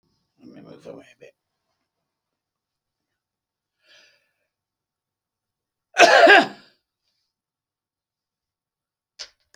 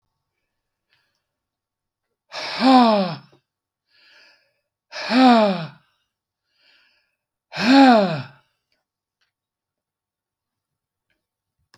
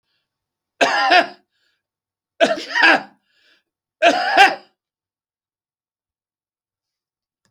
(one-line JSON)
{"cough_length": "9.6 s", "cough_amplitude": 32767, "cough_signal_mean_std_ratio": 0.19, "exhalation_length": "11.8 s", "exhalation_amplitude": 24954, "exhalation_signal_mean_std_ratio": 0.32, "three_cough_length": "7.5 s", "three_cough_amplitude": 32768, "three_cough_signal_mean_std_ratio": 0.33, "survey_phase": "beta (2021-08-13 to 2022-03-07)", "age": "65+", "gender": "Male", "wearing_mask": "No", "symptom_none": true, "smoker_status": "Never smoked", "respiratory_condition_asthma": false, "respiratory_condition_other": false, "recruitment_source": "REACT", "submission_delay": "5 days", "covid_test_result": "Negative", "covid_test_method": "RT-qPCR"}